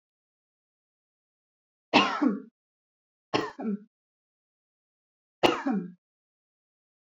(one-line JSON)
{"three_cough_length": "7.1 s", "three_cough_amplitude": 21424, "three_cough_signal_mean_std_ratio": 0.29, "survey_phase": "beta (2021-08-13 to 2022-03-07)", "age": "18-44", "gender": "Female", "wearing_mask": "No", "symptom_none": true, "smoker_status": "Never smoked", "respiratory_condition_asthma": false, "respiratory_condition_other": false, "recruitment_source": "Test and Trace", "submission_delay": "0 days", "covid_test_result": "Negative", "covid_test_method": "LFT"}